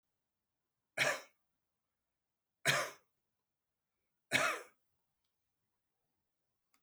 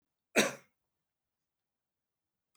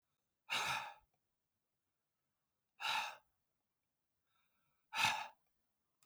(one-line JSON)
{"three_cough_length": "6.8 s", "three_cough_amplitude": 4865, "three_cough_signal_mean_std_ratio": 0.25, "cough_length": "2.6 s", "cough_amplitude": 7596, "cough_signal_mean_std_ratio": 0.18, "exhalation_length": "6.1 s", "exhalation_amplitude": 2726, "exhalation_signal_mean_std_ratio": 0.32, "survey_phase": "beta (2021-08-13 to 2022-03-07)", "age": "65+", "gender": "Male", "wearing_mask": "No", "symptom_headache": true, "symptom_onset": "12 days", "smoker_status": "Ex-smoker", "respiratory_condition_asthma": false, "respiratory_condition_other": false, "recruitment_source": "REACT", "submission_delay": "1 day", "covid_test_result": "Negative", "covid_test_method": "RT-qPCR"}